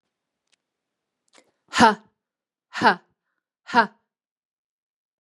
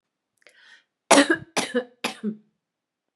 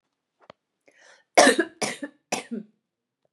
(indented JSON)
{
  "exhalation_length": "5.2 s",
  "exhalation_amplitude": 29107,
  "exhalation_signal_mean_std_ratio": 0.22,
  "cough_length": "3.2 s",
  "cough_amplitude": 28755,
  "cough_signal_mean_std_ratio": 0.3,
  "three_cough_length": "3.3 s",
  "three_cough_amplitude": 28898,
  "three_cough_signal_mean_std_ratio": 0.27,
  "survey_phase": "beta (2021-08-13 to 2022-03-07)",
  "age": "45-64",
  "gender": "Female",
  "wearing_mask": "No",
  "symptom_none": true,
  "smoker_status": "Never smoked",
  "respiratory_condition_asthma": false,
  "respiratory_condition_other": false,
  "recruitment_source": "REACT",
  "submission_delay": "1 day",
  "covid_test_result": "Negative",
  "covid_test_method": "RT-qPCR",
  "influenza_a_test_result": "Negative",
  "influenza_b_test_result": "Negative"
}